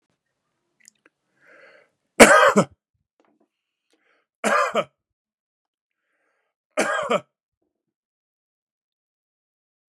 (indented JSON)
{
  "three_cough_length": "9.9 s",
  "three_cough_amplitude": 32768,
  "three_cough_signal_mean_std_ratio": 0.23,
  "survey_phase": "beta (2021-08-13 to 2022-03-07)",
  "age": "45-64",
  "gender": "Male",
  "wearing_mask": "No",
  "symptom_none": true,
  "smoker_status": "Never smoked",
  "respiratory_condition_asthma": true,
  "respiratory_condition_other": false,
  "recruitment_source": "REACT",
  "submission_delay": "1 day",
  "covid_test_result": "Negative",
  "covid_test_method": "RT-qPCR",
  "influenza_a_test_result": "Negative",
  "influenza_b_test_result": "Negative"
}